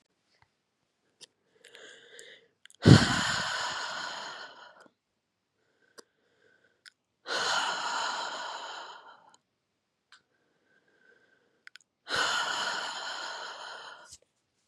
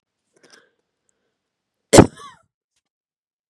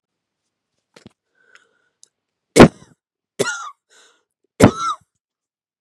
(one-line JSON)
{"exhalation_length": "14.7 s", "exhalation_amplitude": 24800, "exhalation_signal_mean_std_ratio": 0.32, "cough_length": "3.5 s", "cough_amplitude": 32768, "cough_signal_mean_std_ratio": 0.15, "three_cough_length": "5.8 s", "three_cough_amplitude": 32768, "three_cough_signal_mean_std_ratio": 0.2, "survey_phase": "beta (2021-08-13 to 2022-03-07)", "age": "18-44", "gender": "Female", "wearing_mask": "No", "symptom_runny_or_blocked_nose": true, "symptom_sore_throat": true, "symptom_headache": true, "smoker_status": "Never smoked", "respiratory_condition_asthma": false, "respiratory_condition_other": false, "recruitment_source": "Test and Trace", "submission_delay": "1 day", "covid_test_result": "Positive", "covid_test_method": "RT-qPCR", "covid_ct_value": 17.5, "covid_ct_gene": "N gene"}